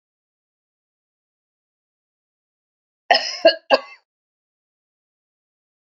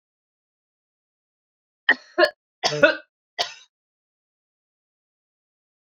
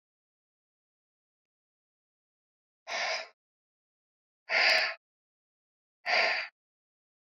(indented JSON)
{
  "cough_length": "5.8 s",
  "cough_amplitude": 27494,
  "cough_signal_mean_std_ratio": 0.18,
  "three_cough_length": "5.9 s",
  "three_cough_amplitude": 29725,
  "three_cough_signal_mean_std_ratio": 0.21,
  "exhalation_length": "7.3 s",
  "exhalation_amplitude": 8720,
  "exhalation_signal_mean_std_ratio": 0.31,
  "survey_phase": "beta (2021-08-13 to 2022-03-07)",
  "age": "45-64",
  "gender": "Female",
  "wearing_mask": "No",
  "symptom_none": true,
  "symptom_onset": "12 days",
  "smoker_status": "Ex-smoker",
  "respiratory_condition_asthma": false,
  "respiratory_condition_other": false,
  "recruitment_source": "REACT",
  "submission_delay": "2 days",
  "covid_test_result": "Negative",
  "covid_test_method": "RT-qPCR",
  "influenza_a_test_result": "Negative",
  "influenza_b_test_result": "Negative"
}